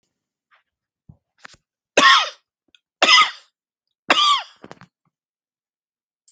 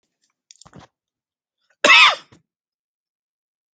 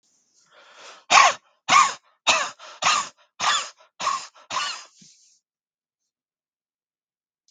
{"three_cough_length": "6.3 s", "three_cough_amplitude": 31046, "three_cough_signal_mean_std_ratio": 0.29, "cough_length": "3.8 s", "cough_amplitude": 29582, "cough_signal_mean_std_ratio": 0.23, "exhalation_length": "7.5 s", "exhalation_amplitude": 28759, "exhalation_signal_mean_std_ratio": 0.34, "survey_phase": "alpha (2021-03-01 to 2021-08-12)", "age": "45-64", "gender": "Male", "wearing_mask": "No", "symptom_none": true, "symptom_onset": "7 days", "smoker_status": "Never smoked", "respiratory_condition_asthma": true, "respiratory_condition_other": false, "recruitment_source": "REACT", "submission_delay": "2 days", "covid_test_result": "Negative", "covid_test_method": "RT-qPCR"}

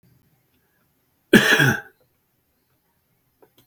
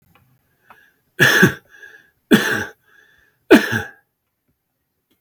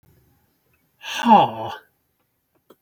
{"cough_length": "3.7 s", "cough_amplitude": 32768, "cough_signal_mean_std_ratio": 0.26, "three_cough_length": "5.2 s", "three_cough_amplitude": 32768, "three_cough_signal_mean_std_ratio": 0.31, "exhalation_length": "2.8 s", "exhalation_amplitude": 31924, "exhalation_signal_mean_std_ratio": 0.29, "survey_phase": "beta (2021-08-13 to 2022-03-07)", "age": "65+", "gender": "Male", "wearing_mask": "No", "symptom_none": true, "symptom_onset": "12 days", "smoker_status": "Ex-smoker", "respiratory_condition_asthma": true, "respiratory_condition_other": false, "recruitment_source": "REACT", "submission_delay": "3 days", "covid_test_result": "Negative", "covid_test_method": "RT-qPCR", "influenza_a_test_result": "Negative", "influenza_b_test_result": "Negative"}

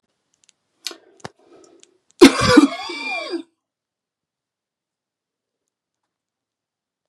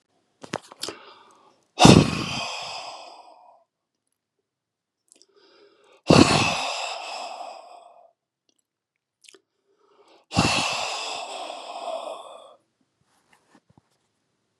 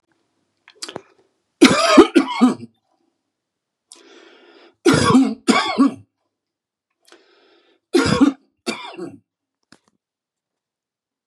{"cough_length": "7.1 s", "cough_amplitude": 32768, "cough_signal_mean_std_ratio": 0.22, "exhalation_length": "14.6 s", "exhalation_amplitude": 32768, "exhalation_signal_mean_std_ratio": 0.29, "three_cough_length": "11.3 s", "three_cough_amplitude": 32768, "three_cough_signal_mean_std_ratio": 0.33, "survey_phase": "beta (2021-08-13 to 2022-03-07)", "age": "45-64", "gender": "Male", "wearing_mask": "No", "symptom_cough_any": true, "symptom_headache": true, "symptom_onset": "4 days", "smoker_status": "Never smoked", "respiratory_condition_asthma": true, "respiratory_condition_other": false, "recruitment_source": "Test and Trace", "submission_delay": "2 days", "covid_test_result": "Positive", "covid_test_method": "ePCR"}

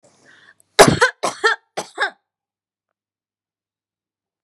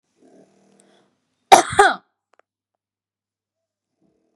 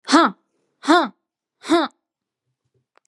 {"three_cough_length": "4.4 s", "three_cough_amplitude": 32768, "three_cough_signal_mean_std_ratio": 0.25, "cough_length": "4.4 s", "cough_amplitude": 32768, "cough_signal_mean_std_ratio": 0.19, "exhalation_length": "3.1 s", "exhalation_amplitude": 29810, "exhalation_signal_mean_std_ratio": 0.35, "survey_phase": "beta (2021-08-13 to 2022-03-07)", "age": "18-44", "gender": "Female", "wearing_mask": "No", "symptom_none": true, "smoker_status": "Current smoker (e-cigarettes or vapes only)", "respiratory_condition_asthma": false, "respiratory_condition_other": false, "recruitment_source": "REACT", "submission_delay": "1 day", "covid_test_result": "Negative", "covid_test_method": "RT-qPCR", "influenza_a_test_result": "Negative", "influenza_b_test_result": "Negative"}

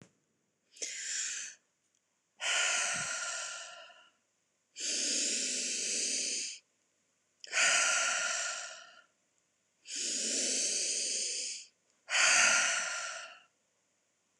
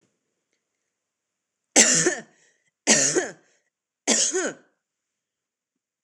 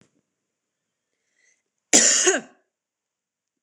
{"exhalation_length": "14.4 s", "exhalation_amplitude": 7400, "exhalation_signal_mean_std_ratio": 0.62, "three_cough_length": "6.0 s", "three_cough_amplitude": 26028, "three_cough_signal_mean_std_ratio": 0.34, "cough_length": "3.6 s", "cough_amplitude": 26028, "cough_signal_mean_std_ratio": 0.27, "survey_phase": "beta (2021-08-13 to 2022-03-07)", "age": "18-44", "gender": "Female", "wearing_mask": "No", "symptom_fatigue": true, "symptom_onset": "3 days", "smoker_status": "Current smoker (1 to 10 cigarettes per day)", "respiratory_condition_asthma": false, "respiratory_condition_other": false, "recruitment_source": "REACT", "submission_delay": "3 days", "covid_test_result": "Negative", "covid_test_method": "RT-qPCR", "influenza_a_test_result": "Negative", "influenza_b_test_result": "Negative"}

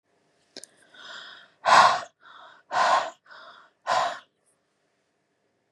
{"exhalation_length": "5.7 s", "exhalation_amplitude": 21781, "exhalation_signal_mean_std_ratio": 0.33, "survey_phase": "beta (2021-08-13 to 2022-03-07)", "age": "18-44", "gender": "Female", "wearing_mask": "No", "symptom_cough_any": true, "symptom_runny_or_blocked_nose": true, "symptom_sore_throat": true, "symptom_fatigue": true, "symptom_headache": true, "symptom_change_to_sense_of_smell_or_taste": true, "smoker_status": "Never smoked", "respiratory_condition_asthma": true, "respiratory_condition_other": false, "recruitment_source": "Test and Trace", "submission_delay": "2 days", "covid_test_result": "Positive", "covid_test_method": "RT-qPCR", "covid_ct_value": 19.9, "covid_ct_gene": "ORF1ab gene", "covid_ct_mean": 20.3, "covid_viral_load": "230000 copies/ml", "covid_viral_load_category": "Low viral load (10K-1M copies/ml)"}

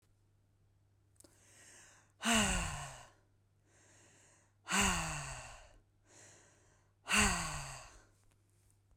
{"exhalation_length": "9.0 s", "exhalation_amplitude": 4498, "exhalation_signal_mean_std_ratio": 0.38, "survey_phase": "beta (2021-08-13 to 2022-03-07)", "age": "45-64", "gender": "Female", "wearing_mask": "No", "symptom_none": true, "smoker_status": "Current smoker (11 or more cigarettes per day)", "respiratory_condition_asthma": true, "respiratory_condition_other": false, "recruitment_source": "Test and Trace", "submission_delay": "2 days", "covid_test_result": "Negative", "covid_test_method": "ePCR"}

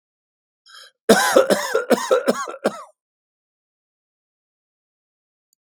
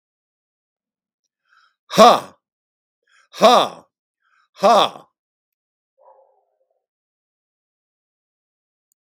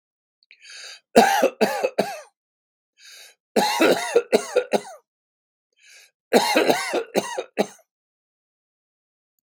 {"cough_length": "5.7 s", "cough_amplitude": 32768, "cough_signal_mean_std_ratio": 0.34, "exhalation_length": "9.0 s", "exhalation_amplitude": 32768, "exhalation_signal_mean_std_ratio": 0.23, "three_cough_length": "9.5 s", "three_cough_amplitude": 32768, "three_cough_signal_mean_std_ratio": 0.39, "survey_phase": "beta (2021-08-13 to 2022-03-07)", "age": "65+", "gender": "Male", "wearing_mask": "No", "symptom_none": true, "smoker_status": "Ex-smoker", "respiratory_condition_asthma": false, "respiratory_condition_other": false, "recruitment_source": "REACT", "submission_delay": "2 days", "covid_test_result": "Negative", "covid_test_method": "RT-qPCR"}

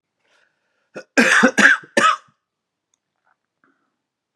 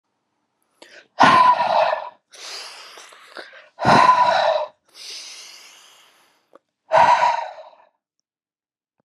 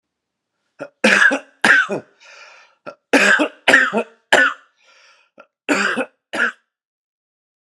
{"cough_length": "4.4 s", "cough_amplitude": 32621, "cough_signal_mean_std_ratio": 0.33, "exhalation_length": "9.0 s", "exhalation_amplitude": 29934, "exhalation_signal_mean_std_ratio": 0.43, "three_cough_length": "7.7 s", "three_cough_amplitude": 32768, "three_cough_signal_mean_std_ratio": 0.41, "survey_phase": "beta (2021-08-13 to 2022-03-07)", "age": "45-64", "gender": "Male", "wearing_mask": "No", "symptom_cough_any": true, "symptom_new_continuous_cough": true, "symptom_runny_or_blocked_nose": true, "symptom_shortness_of_breath": true, "symptom_sore_throat": true, "symptom_fatigue": true, "symptom_fever_high_temperature": true, "symptom_headache": true, "symptom_onset": "4 days", "smoker_status": "Ex-smoker", "respiratory_condition_asthma": false, "respiratory_condition_other": false, "recruitment_source": "Test and Trace", "submission_delay": "2 days", "covid_test_result": "Positive", "covid_test_method": "RT-qPCR", "covid_ct_value": 20.2, "covid_ct_gene": "ORF1ab gene", "covid_ct_mean": 21.0, "covid_viral_load": "130000 copies/ml", "covid_viral_load_category": "Low viral load (10K-1M copies/ml)"}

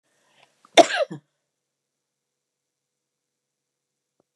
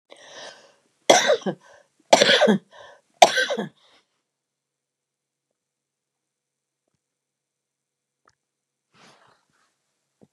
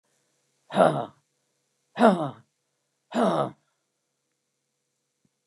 {"cough_length": "4.4 s", "cough_amplitude": 32768, "cough_signal_mean_std_ratio": 0.14, "three_cough_length": "10.3 s", "three_cough_amplitude": 32768, "three_cough_signal_mean_std_ratio": 0.24, "exhalation_length": "5.5 s", "exhalation_amplitude": 22775, "exhalation_signal_mean_std_ratio": 0.3, "survey_phase": "beta (2021-08-13 to 2022-03-07)", "age": "65+", "gender": "Female", "wearing_mask": "No", "symptom_none": true, "smoker_status": "Current smoker (11 or more cigarettes per day)", "respiratory_condition_asthma": false, "respiratory_condition_other": true, "recruitment_source": "REACT", "submission_delay": "1 day", "covid_test_result": "Negative", "covid_test_method": "RT-qPCR", "influenza_a_test_result": "Negative", "influenza_b_test_result": "Negative"}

